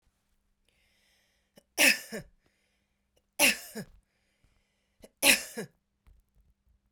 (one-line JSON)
{"three_cough_length": "6.9 s", "three_cough_amplitude": 15250, "three_cough_signal_mean_std_ratio": 0.24, "survey_phase": "beta (2021-08-13 to 2022-03-07)", "age": "45-64", "gender": "Female", "wearing_mask": "No", "symptom_none": true, "smoker_status": "Never smoked", "respiratory_condition_asthma": false, "respiratory_condition_other": false, "recruitment_source": "REACT", "submission_delay": "9 days", "covid_test_result": "Negative", "covid_test_method": "RT-qPCR"}